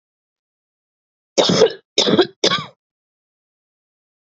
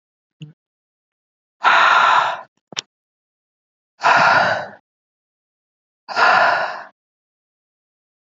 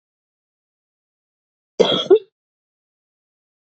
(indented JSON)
{
  "three_cough_length": "4.4 s",
  "three_cough_amplitude": 31663,
  "three_cough_signal_mean_std_ratio": 0.33,
  "exhalation_length": "8.3 s",
  "exhalation_amplitude": 27991,
  "exhalation_signal_mean_std_ratio": 0.4,
  "cough_length": "3.8 s",
  "cough_amplitude": 27633,
  "cough_signal_mean_std_ratio": 0.21,
  "survey_phase": "beta (2021-08-13 to 2022-03-07)",
  "age": "18-44",
  "gender": "Female",
  "wearing_mask": "No",
  "symptom_cough_any": true,
  "symptom_new_continuous_cough": true,
  "symptom_runny_or_blocked_nose": true,
  "symptom_sore_throat": true,
  "symptom_fatigue": true,
  "symptom_other": true,
  "symptom_onset": "2 days",
  "smoker_status": "Current smoker (e-cigarettes or vapes only)",
  "respiratory_condition_asthma": false,
  "respiratory_condition_other": false,
  "recruitment_source": "Test and Trace",
  "submission_delay": "1 day",
  "covid_test_result": "Positive",
  "covid_test_method": "RT-qPCR",
  "covid_ct_value": 23.1,
  "covid_ct_gene": "ORF1ab gene"
}